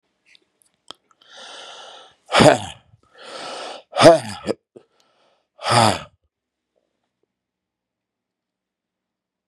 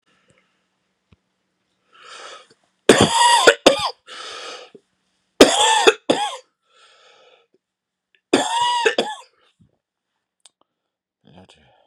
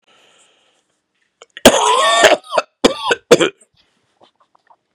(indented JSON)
{
  "exhalation_length": "9.5 s",
  "exhalation_amplitude": 32768,
  "exhalation_signal_mean_std_ratio": 0.25,
  "three_cough_length": "11.9 s",
  "three_cough_amplitude": 32768,
  "three_cough_signal_mean_std_ratio": 0.33,
  "cough_length": "4.9 s",
  "cough_amplitude": 32768,
  "cough_signal_mean_std_ratio": 0.37,
  "survey_phase": "beta (2021-08-13 to 2022-03-07)",
  "age": "65+",
  "gender": "Male",
  "wearing_mask": "No",
  "symptom_new_continuous_cough": true,
  "symptom_runny_or_blocked_nose": true,
  "symptom_sore_throat": true,
  "symptom_fatigue": true,
  "symptom_headache": true,
  "symptom_other": true,
  "smoker_status": "Ex-smoker",
  "respiratory_condition_asthma": false,
  "respiratory_condition_other": false,
  "recruitment_source": "Test and Trace",
  "submission_delay": "1 day",
  "covid_test_result": "Positive",
  "covid_test_method": "RT-qPCR",
  "covid_ct_value": 20.1,
  "covid_ct_gene": "N gene"
}